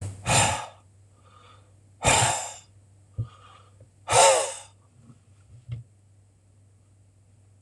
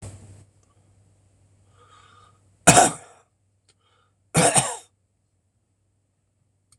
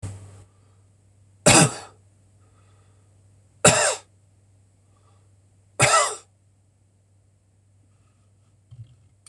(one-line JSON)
{"exhalation_length": "7.6 s", "exhalation_amplitude": 20152, "exhalation_signal_mean_std_ratio": 0.36, "cough_length": "6.8 s", "cough_amplitude": 26028, "cough_signal_mean_std_ratio": 0.23, "three_cough_length": "9.3 s", "three_cough_amplitude": 26027, "three_cough_signal_mean_std_ratio": 0.26, "survey_phase": "beta (2021-08-13 to 2022-03-07)", "age": "65+", "gender": "Male", "wearing_mask": "No", "symptom_cough_any": true, "symptom_runny_or_blocked_nose": true, "symptom_onset": "12 days", "smoker_status": "Ex-smoker", "respiratory_condition_asthma": false, "respiratory_condition_other": false, "recruitment_source": "REACT", "submission_delay": "1 day", "covid_test_result": "Positive", "covid_test_method": "RT-qPCR", "covid_ct_value": 37.0, "covid_ct_gene": "N gene", "influenza_a_test_result": "Negative", "influenza_b_test_result": "Negative"}